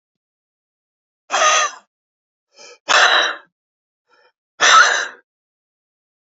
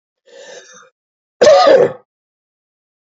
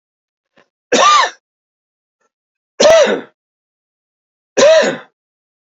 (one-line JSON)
{"exhalation_length": "6.2 s", "exhalation_amplitude": 32767, "exhalation_signal_mean_std_ratio": 0.36, "cough_length": "3.1 s", "cough_amplitude": 32418, "cough_signal_mean_std_ratio": 0.36, "three_cough_length": "5.6 s", "three_cough_amplitude": 30964, "three_cough_signal_mean_std_ratio": 0.39, "survey_phase": "beta (2021-08-13 to 2022-03-07)", "age": "65+", "gender": "Male", "wearing_mask": "No", "symptom_cough_any": true, "symptom_runny_or_blocked_nose": true, "symptom_shortness_of_breath": true, "symptom_sore_throat": true, "symptom_fatigue": true, "symptom_headache": true, "symptom_onset": "2 days", "smoker_status": "Never smoked", "respiratory_condition_asthma": true, "respiratory_condition_other": false, "recruitment_source": "Test and Trace", "submission_delay": "2 days", "covid_test_result": "Positive", "covid_test_method": "RT-qPCR", "covid_ct_value": 17.3, "covid_ct_gene": "N gene", "covid_ct_mean": 17.3, "covid_viral_load": "2200000 copies/ml", "covid_viral_load_category": "High viral load (>1M copies/ml)"}